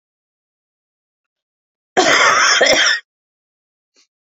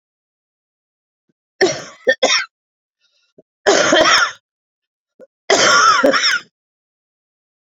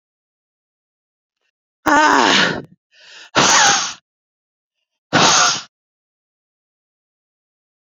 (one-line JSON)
{"cough_length": "4.3 s", "cough_amplitude": 32768, "cough_signal_mean_std_ratio": 0.41, "three_cough_length": "7.7 s", "three_cough_amplitude": 32768, "three_cough_signal_mean_std_ratio": 0.43, "exhalation_length": "7.9 s", "exhalation_amplitude": 32768, "exhalation_signal_mean_std_ratio": 0.37, "survey_phase": "beta (2021-08-13 to 2022-03-07)", "age": "45-64", "gender": "Female", "wearing_mask": "No", "symptom_cough_any": true, "symptom_runny_or_blocked_nose": true, "symptom_sore_throat": true, "symptom_diarrhoea": true, "symptom_fatigue": true, "symptom_fever_high_temperature": true, "symptom_headache": true, "symptom_other": true, "smoker_status": "Ex-smoker", "respiratory_condition_asthma": false, "respiratory_condition_other": false, "recruitment_source": "Test and Trace", "submission_delay": "1 day", "covid_test_result": "Positive", "covid_test_method": "LAMP"}